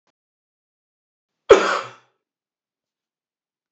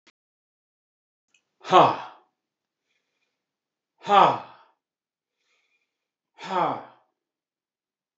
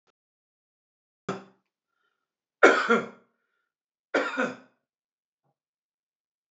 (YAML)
cough_length: 3.7 s
cough_amplitude: 29968
cough_signal_mean_std_ratio: 0.18
exhalation_length: 8.2 s
exhalation_amplitude: 25946
exhalation_signal_mean_std_ratio: 0.23
three_cough_length: 6.5 s
three_cough_amplitude: 23785
three_cough_signal_mean_std_ratio: 0.23
survey_phase: beta (2021-08-13 to 2022-03-07)
age: 45-64
gender: Male
wearing_mask: 'No'
symptom_none: true
smoker_status: Never smoked
respiratory_condition_asthma: false
respiratory_condition_other: false
recruitment_source: REACT
submission_delay: 3 days
covid_test_result: Negative
covid_test_method: RT-qPCR
influenza_a_test_result: Negative
influenza_b_test_result: Negative